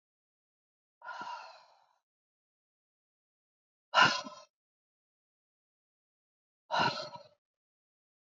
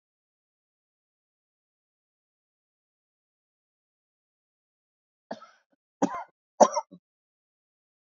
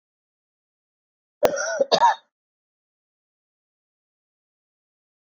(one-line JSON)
{"exhalation_length": "8.3 s", "exhalation_amplitude": 9419, "exhalation_signal_mean_std_ratio": 0.22, "three_cough_length": "8.1 s", "three_cough_amplitude": 22126, "three_cough_signal_mean_std_ratio": 0.12, "cough_length": "5.2 s", "cough_amplitude": 21613, "cough_signal_mean_std_ratio": 0.25, "survey_phase": "beta (2021-08-13 to 2022-03-07)", "age": "65+", "gender": "Female", "wearing_mask": "No", "symptom_none": true, "smoker_status": "Current smoker (1 to 10 cigarettes per day)", "respiratory_condition_asthma": true, "respiratory_condition_other": false, "recruitment_source": "REACT", "submission_delay": "2 days", "covid_test_result": "Negative", "covid_test_method": "RT-qPCR", "influenza_a_test_result": "Unknown/Void", "influenza_b_test_result": "Unknown/Void"}